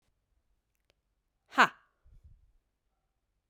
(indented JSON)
{
  "exhalation_length": "3.5 s",
  "exhalation_amplitude": 12852,
  "exhalation_signal_mean_std_ratio": 0.13,
  "survey_phase": "beta (2021-08-13 to 2022-03-07)",
  "age": "18-44",
  "gender": "Female",
  "wearing_mask": "No",
  "symptom_cough_any": true,
  "symptom_runny_or_blocked_nose": true,
  "symptom_change_to_sense_of_smell_or_taste": true,
  "symptom_loss_of_taste": true,
  "smoker_status": "Ex-smoker",
  "respiratory_condition_asthma": false,
  "respiratory_condition_other": false,
  "recruitment_source": "Test and Trace",
  "submission_delay": "2 days",
  "covid_test_result": "Positive",
  "covid_test_method": "RT-qPCR",
  "covid_ct_value": 21.7,
  "covid_ct_gene": "ORF1ab gene"
}